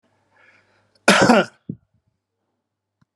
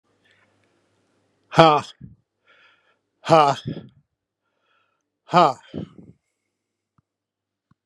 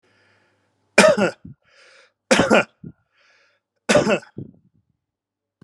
{"cough_length": "3.2 s", "cough_amplitude": 32714, "cough_signal_mean_std_ratio": 0.27, "exhalation_length": "7.9 s", "exhalation_amplitude": 32768, "exhalation_signal_mean_std_ratio": 0.23, "three_cough_length": "5.6 s", "three_cough_amplitude": 32768, "three_cough_signal_mean_std_ratio": 0.32, "survey_phase": "beta (2021-08-13 to 2022-03-07)", "age": "65+", "gender": "Male", "wearing_mask": "No", "symptom_none": true, "smoker_status": "Ex-smoker", "respiratory_condition_asthma": false, "respiratory_condition_other": false, "recruitment_source": "REACT", "submission_delay": "1 day", "covid_test_result": "Negative", "covid_test_method": "RT-qPCR", "influenza_a_test_result": "Unknown/Void", "influenza_b_test_result": "Unknown/Void"}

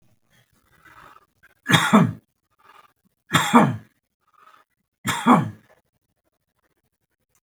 {"three_cough_length": "7.4 s", "three_cough_amplitude": 32766, "three_cough_signal_mean_std_ratio": 0.3, "survey_phase": "beta (2021-08-13 to 2022-03-07)", "age": "65+", "gender": "Male", "wearing_mask": "No", "symptom_none": true, "smoker_status": "Never smoked", "respiratory_condition_asthma": false, "respiratory_condition_other": false, "recruitment_source": "REACT", "submission_delay": "10 days", "covid_test_result": "Negative", "covid_test_method": "RT-qPCR"}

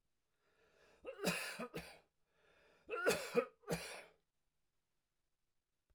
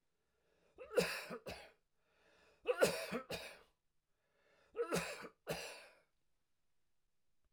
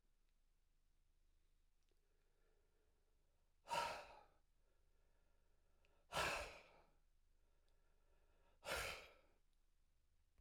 {"cough_length": "5.9 s", "cough_amplitude": 2607, "cough_signal_mean_std_ratio": 0.36, "three_cough_length": "7.5 s", "three_cough_amplitude": 3449, "three_cough_signal_mean_std_ratio": 0.36, "exhalation_length": "10.4 s", "exhalation_amplitude": 979, "exhalation_signal_mean_std_ratio": 0.33, "survey_phase": "alpha (2021-03-01 to 2021-08-12)", "age": "65+", "gender": "Male", "wearing_mask": "No", "symptom_fatigue": true, "symptom_onset": "12 days", "smoker_status": "Never smoked", "respiratory_condition_asthma": false, "respiratory_condition_other": false, "recruitment_source": "REACT", "submission_delay": "2 days", "covid_test_result": "Negative", "covid_test_method": "RT-qPCR"}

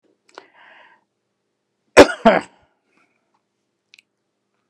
{"cough_length": "4.7 s", "cough_amplitude": 32768, "cough_signal_mean_std_ratio": 0.17, "survey_phase": "beta (2021-08-13 to 2022-03-07)", "age": "65+", "gender": "Male", "wearing_mask": "No", "symptom_none": true, "smoker_status": "Ex-smoker", "respiratory_condition_asthma": false, "respiratory_condition_other": false, "recruitment_source": "REACT", "submission_delay": "3 days", "covid_test_result": "Negative", "covid_test_method": "RT-qPCR"}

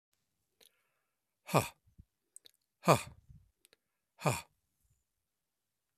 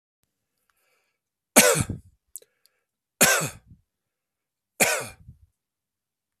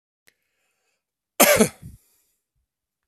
{"exhalation_length": "6.0 s", "exhalation_amplitude": 12243, "exhalation_signal_mean_std_ratio": 0.18, "three_cough_length": "6.4 s", "three_cough_amplitude": 32767, "three_cough_signal_mean_std_ratio": 0.26, "cough_length": "3.1 s", "cough_amplitude": 32767, "cough_signal_mean_std_ratio": 0.23, "survey_phase": "alpha (2021-03-01 to 2021-08-12)", "age": "45-64", "gender": "Male", "wearing_mask": "No", "symptom_headache": true, "symptom_onset": "6 days", "smoker_status": "Never smoked", "respiratory_condition_asthma": false, "respiratory_condition_other": false, "recruitment_source": "REACT", "submission_delay": "1 day", "covid_test_result": "Negative", "covid_test_method": "RT-qPCR"}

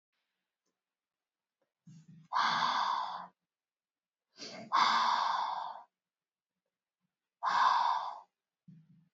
{"exhalation_length": "9.1 s", "exhalation_amplitude": 5854, "exhalation_signal_mean_std_ratio": 0.45, "survey_phase": "beta (2021-08-13 to 2022-03-07)", "age": "18-44", "gender": "Female", "wearing_mask": "Yes", "symptom_runny_or_blocked_nose": true, "symptom_change_to_sense_of_smell_or_taste": true, "symptom_onset": "6 days", "smoker_status": "Never smoked", "respiratory_condition_asthma": false, "respiratory_condition_other": false, "recruitment_source": "Test and Trace", "submission_delay": "2 days", "covid_test_result": "Positive", "covid_test_method": "RT-qPCR", "covid_ct_value": 26.0, "covid_ct_gene": "ORF1ab gene", "covid_ct_mean": 26.4, "covid_viral_load": "2200 copies/ml", "covid_viral_load_category": "Minimal viral load (< 10K copies/ml)"}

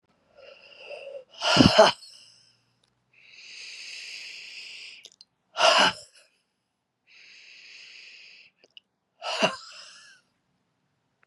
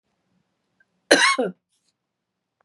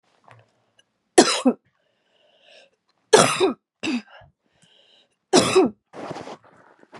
{"exhalation_length": "11.3 s", "exhalation_amplitude": 29064, "exhalation_signal_mean_std_ratio": 0.28, "cough_length": "2.6 s", "cough_amplitude": 31445, "cough_signal_mean_std_ratio": 0.27, "three_cough_length": "7.0 s", "three_cough_amplitude": 32768, "three_cough_signal_mean_std_ratio": 0.32, "survey_phase": "beta (2021-08-13 to 2022-03-07)", "age": "45-64", "gender": "Female", "wearing_mask": "No", "symptom_cough_any": true, "symptom_runny_or_blocked_nose": true, "symptom_shortness_of_breath": true, "symptom_other": true, "symptom_onset": "4 days", "smoker_status": "Never smoked", "respiratory_condition_asthma": true, "respiratory_condition_other": false, "recruitment_source": "Test and Trace", "submission_delay": "2 days", "covid_test_result": "Positive", "covid_test_method": "RT-qPCR", "covid_ct_value": 18.0, "covid_ct_gene": "ORF1ab gene", "covid_ct_mean": 18.4, "covid_viral_load": "920000 copies/ml", "covid_viral_load_category": "Low viral load (10K-1M copies/ml)"}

